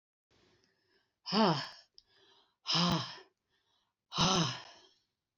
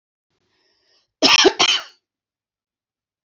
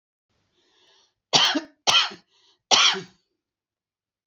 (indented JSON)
{
  "exhalation_length": "5.4 s",
  "exhalation_amplitude": 6111,
  "exhalation_signal_mean_std_ratio": 0.38,
  "cough_length": "3.2 s",
  "cough_amplitude": 28354,
  "cough_signal_mean_std_ratio": 0.3,
  "three_cough_length": "4.3 s",
  "three_cough_amplitude": 27562,
  "three_cough_signal_mean_std_ratio": 0.33,
  "survey_phase": "beta (2021-08-13 to 2022-03-07)",
  "age": "45-64",
  "gender": "Female",
  "wearing_mask": "No",
  "symptom_none": true,
  "smoker_status": "Ex-smoker",
  "respiratory_condition_asthma": false,
  "respiratory_condition_other": false,
  "recruitment_source": "REACT",
  "submission_delay": "1 day",
  "covid_test_result": "Negative",
  "covid_test_method": "RT-qPCR",
  "influenza_a_test_result": "Negative",
  "influenza_b_test_result": "Negative"
}